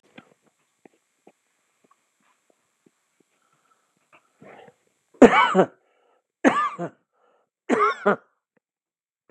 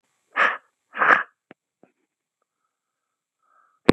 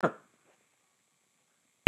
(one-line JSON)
{"three_cough_length": "9.3 s", "three_cough_amplitude": 32768, "three_cough_signal_mean_std_ratio": 0.24, "exhalation_length": "3.9 s", "exhalation_amplitude": 32768, "exhalation_signal_mean_std_ratio": 0.23, "cough_length": "1.9 s", "cough_amplitude": 32768, "cough_signal_mean_std_ratio": 0.1, "survey_phase": "beta (2021-08-13 to 2022-03-07)", "age": "65+", "gender": "Male", "wearing_mask": "No", "symptom_runny_or_blocked_nose": true, "symptom_abdominal_pain": true, "symptom_diarrhoea": true, "symptom_fatigue": true, "smoker_status": "Ex-smoker", "respiratory_condition_asthma": false, "respiratory_condition_other": false, "recruitment_source": "REACT", "submission_delay": "6 days", "covid_test_result": "Negative", "covid_test_method": "RT-qPCR", "influenza_a_test_result": "Negative", "influenza_b_test_result": "Negative"}